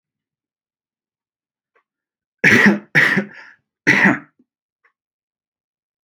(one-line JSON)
{"cough_length": "6.0 s", "cough_amplitude": 32701, "cough_signal_mean_std_ratio": 0.31, "survey_phase": "alpha (2021-03-01 to 2021-08-12)", "age": "18-44", "gender": "Male", "wearing_mask": "No", "symptom_none": true, "smoker_status": "Never smoked", "respiratory_condition_asthma": false, "respiratory_condition_other": false, "recruitment_source": "REACT", "submission_delay": "1 day", "covid_test_result": "Negative", "covid_test_method": "RT-qPCR", "covid_ct_value": 42.0, "covid_ct_gene": "E gene"}